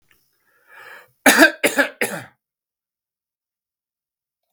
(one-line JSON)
{"cough_length": "4.5 s", "cough_amplitude": 32768, "cough_signal_mean_std_ratio": 0.26, "survey_phase": "beta (2021-08-13 to 2022-03-07)", "age": "65+", "gender": "Male", "wearing_mask": "No", "symptom_none": true, "smoker_status": "Never smoked", "respiratory_condition_asthma": false, "respiratory_condition_other": false, "recruitment_source": "REACT", "submission_delay": "2 days", "covid_test_result": "Negative", "covid_test_method": "RT-qPCR", "influenza_a_test_result": "Unknown/Void", "influenza_b_test_result": "Unknown/Void"}